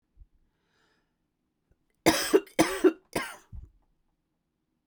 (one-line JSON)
{"cough_length": "4.9 s", "cough_amplitude": 17799, "cough_signal_mean_std_ratio": 0.27, "survey_phase": "beta (2021-08-13 to 2022-03-07)", "age": "45-64", "gender": "Female", "wearing_mask": "No", "symptom_cough_any": true, "symptom_runny_or_blocked_nose": true, "symptom_shortness_of_breath": true, "symptom_sore_throat": true, "symptom_fatigue": true, "symptom_headache": true, "symptom_change_to_sense_of_smell_or_taste": true, "symptom_loss_of_taste": true, "symptom_other": true, "symptom_onset": "5 days", "smoker_status": "Never smoked", "respiratory_condition_asthma": false, "respiratory_condition_other": false, "recruitment_source": "Test and Trace", "submission_delay": "2 days", "covid_test_result": "Positive", "covid_test_method": "RT-qPCR", "covid_ct_value": 19.9, "covid_ct_gene": "ORF1ab gene", "covid_ct_mean": 20.0, "covid_viral_load": "270000 copies/ml", "covid_viral_load_category": "Low viral load (10K-1M copies/ml)"}